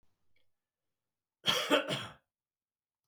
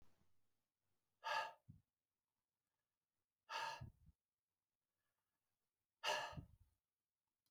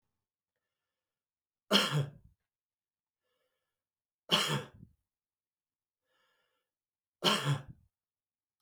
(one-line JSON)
{"cough_length": "3.1 s", "cough_amplitude": 6998, "cough_signal_mean_std_ratio": 0.31, "exhalation_length": "7.5 s", "exhalation_amplitude": 1123, "exhalation_signal_mean_std_ratio": 0.29, "three_cough_length": "8.6 s", "three_cough_amplitude": 10377, "three_cough_signal_mean_std_ratio": 0.27, "survey_phase": "beta (2021-08-13 to 2022-03-07)", "age": "45-64", "gender": "Male", "wearing_mask": "No", "symptom_none": true, "smoker_status": "Never smoked", "respiratory_condition_asthma": false, "respiratory_condition_other": false, "recruitment_source": "REACT", "submission_delay": "2 days", "covid_test_result": "Negative", "covid_test_method": "RT-qPCR"}